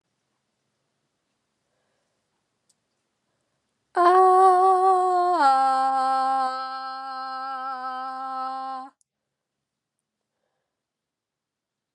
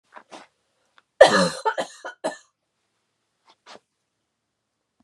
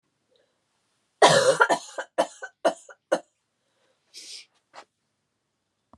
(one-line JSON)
{"exhalation_length": "11.9 s", "exhalation_amplitude": 13986, "exhalation_signal_mean_std_ratio": 0.47, "three_cough_length": "5.0 s", "three_cough_amplitude": 32768, "three_cough_signal_mean_std_ratio": 0.22, "cough_length": "6.0 s", "cough_amplitude": 25628, "cough_signal_mean_std_ratio": 0.28, "survey_phase": "beta (2021-08-13 to 2022-03-07)", "age": "45-64", "gender": "Female", "wearing_mask": "No", "symptom_cough_any": true, "symptom_runny_or_blocked_nose": true, "symptom_sore_throat": true, "symptom_fatigue": true, "symptom_fever_high_temperature": true, "symptom_headache": true, "symptom_change_to_sense_of_smell_or_taste": true, "symptom_loss_of_taste": true, "smoker_status": "Prefer not to say", "respiratory_condition_asthma": false, "respiratory_condition_other": false, "recruitment_source": "Test and Trace", "submission_delay": "2 days", "covid_test_result": "Positive", "covid_test_method": "RT-qPCR", "covid_ct_value": 18.2, "covid_ct_gene": "ORF1ab gene", "covid_ct_mean": 18.7, "covid_viral_load": "720000 copies/ml", "covid_viral_load_category": "Low viral load (10K-1M copies/ml)"}